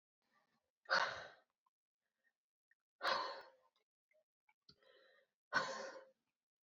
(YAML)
exhalation_length: 6.7 s
exhalation_amplitude: 2436
exhalation_signal_mean_std_ratio: 0.3
survey_phase: beta (2021-08-13 to 2022-03-07)
age: 18-44
gender: Female
wearing_mask: 'No'
symptom_cough_any: true
symptom_sore_throat: true
symptom_fever_high_temperature: true
symptom_headache: true
smoker_status: Ex-smoker
respiratory_condition_asthma: false
respiratory_condition_other: false
recruitment_source: Test and Trace
submission_delay: 2 days
covid_test_result: Positive
covid_test_method: RT-qPCR
covid_ct_value: 25.7
covid_ct_gene: ORF1ab gene
covid_ct_mean: 26.2
covid_viral_load: 2500 copies/ml
covid_viral_load_category: Minimal viral load (< 10K copies/ml)